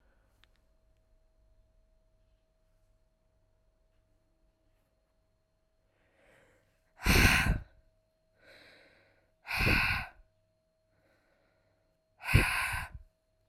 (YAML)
exhalation_length: 13.5 s
exhalation_amplitude: 11070
exhalation_signal_mean_std_ratio: 0.28
survey_phase: alpha (2021-03-01 to 2021-08-12)
age: 18-44
gender: Female
wearing_mask: 'No'
symptom_cough_any: true
symptom_new_continuous_cough: true
symptom_shortness_of_breath: true
symptom_fatigue: true
symptom_headache: true
smoker_status: Current smoker (1 to 10 cigarettes per day)
respiratory_condition_asthma: false
respiratory_condition_other: false
recruitment_source: Test and Trace
submission_delay: 1 day
covid_test_result: Positive
covid_test_method: RT-qPCR
covid_ct_value: 20.5
covid_ct_gene: ORF1ab gene
covid_ct_mean: 21.8
covid_viral_load: 73000 copies/ml
covid_viral_load_category: Low viral load (10K-1M copies/ml)